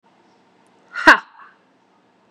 {
  "exhalation_length": "2.3 s",
  "exhalation_amplitude": 32768,
  "exhalation_signal_mean_std_ratio": 0.2,
  "survey_phase": "beta (2021-08-13 to 2022-03-07)",
  "age": "18-44",
  "gender": "Female",
  "wearing_mask": "No",
  "symptom_cough_any": true,
  "symptom_runny_or_blocked_nose": true,
  "symptom_shortness_of_breath": true,
  "symptom_headache": true,
  "symptom_change_to_sense_of_smell_or_taste": true,
  "symptom_onset": "2 days",
  "smoker_status": "Ex-smoker",
  "respiratory_condition_asthma": false,
  "respiratory_condition_other": false,
  "recruitment_source": "Test and Trace",
  "submission_delay": "1 day",
  "covid_test_result": "Positive",
  "covid_test_method": "RT-qPCR",
  "covid_ct_value": 27.6,
  "covid_ct_gene": "ORF1ab gene",
  "covid_ct_mean": 28.2,
  "covid_viral_load": "540 copies/ml",
  "covid_viral_load_category": "Minimal viral load (< 10K copies/ml)"
}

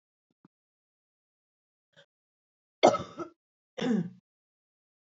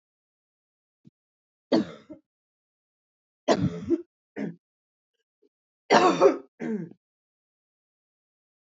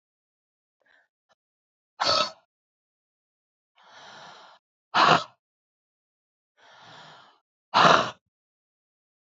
{
  "cough_length": "5.0 s",
  "cough_amplitude": 14721,
  "cough_signal_mean_std_ratio": 0.21,
  "three_cough_length": "8.6 s",
  "three_cough_amplitude": 21457,
  "three_cough_signal_mean_std_ratio": 0.28,
  "exhalation_length": "9.3 s",
  "exhalation_amplitude": 27205,
  "exhalation_signal_mean_std_ratio": 0.24,
  "survey_phase": "beta (2021-08-13 to 2022-03-07)",
  "age": "18-44",
  "gender": "Female",
  "wearing_mask": "No",
  "symptom_cough_any": true,
  "symptom_runny_or_blocked_nose": true,
  "symptom_sore_throat": true,
  "symptom_fatigue": true,
  "symptom_fever_high_temperature": true,
  "symptom_headache": true,
  "symptom_onset": "2 days",
  "smoker_status": "Current smoker (e-cigarettes or vapes only)",
  "respiratory_condition_asthma": false,
  "respiratory_condition_other": false,
  "recruitment_source": "Test and Trace",
  "submission_delay": "1 day",
  "covid_test_result": "Positive",
  "covid_test_method": "RT-qPCR",
  "covid_ct_value": 26.3,
  "covid_ct_gene": "ORF1ab gene"
}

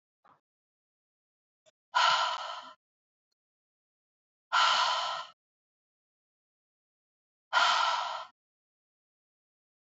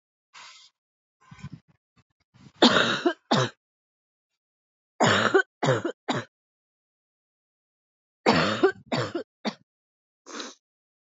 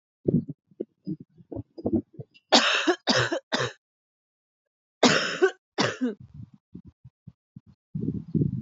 {
  "exhalation_length": "9.8 s",
  "exhalation_amplitude": 7283,
  "exhalation_signal_mean_std_ratio": 0.35,
  "three_cough_length": "11.1 s",
  "three_cough_amplitude": 21727,
  "three_cough_signal_mean_std_ratio": 0.34,
  "cough_length": "8.6 s",
  "cough_amplitude": 21706,
  "cough_signal_mean_std_ratio": 0.42,
  "survey_phase": "alpha (2021-03-01 to 2021-08-12)",
  "age": "18-44",
  "gender": "Female",
  "wearing_mask": "No",
  "symptom_new_continuous_cough": true,
  "symptom_fatigue": true,
  "symptom_onset": "7 days",
  "smoker_status": "Ex-smoker",
  "respiratory_condition_asthma": false,
  "respiratory_condition_other": false,
  "recruitment_source": "Test and Trace",
  "submission_delay": "2 days",
  "covid_test_result": "Positive",
  "covid_test_method": "RT-qPCR",
  "covid_ct_value": 23.3,
  "covid_ct_gene": "ORF1ab gene",
  "covid_ct_mean": 23.9,
  "covid_viral_load": "15000 copies/ml",
  "covid_viral_load_category": "Low viral load (10K-1M copies/ml)"
}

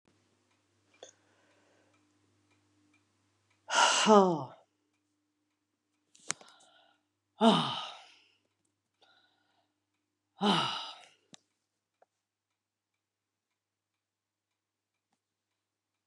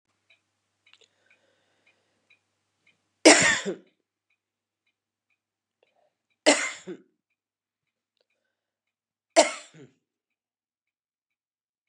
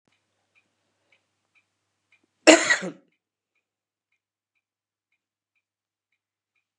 {
  "exhalation_length": "16.1 s",
  "exhalation_amplitude": 12904,
  "exhalation_signal_mean_std_ratio": 0.23,
  "three_cough_length": "11.9 s",
  "three_cough_amplitude": 31721,
  "three_cough_signal_mean_std_ratio": 0.18,
  "cough_length": "6.8 s",
  "cough_amplitude": 32768,
  "cough_signal_mean_std_ratio": 0.14,
  "survey_phase": "beta (2021-08-13 to 2022-03-07)",
  "age": "65+",
  "gender": "Female",
  "wearing_mask": "No",
  "symptom_runny_or_blocked_nose": true,
  "symptom_shortness_of_breath": true,
  "symptom_fatigue": true,
  "symptom_fever_high_temperature": true,
  "symptom_headache": true,
  "symptom_change_to_sense_of_smell_or_taste": true,
  "symptom_onset": "5 days",
  "smoker_status": "Ex-smoker",
  "respiratory_condition_asthma": false,
  "respiratory_condition_other": false,
  "recruitment_source": "Test and Trace",
  "submission_delay": "2 days",
  "covid_test_result": "Positive",
  "covid_test_method": "RT-qPCR",
  "covid_ct_value": 16.6,
  "covid_ct_gene": "ORF1ab gene",
  "covid_ct_mean": 16.9,
  "covid_viral_load": "2800000 copies/ml",
  "covid_viral_load_category": "High viral load (>1M copies/ml)"
}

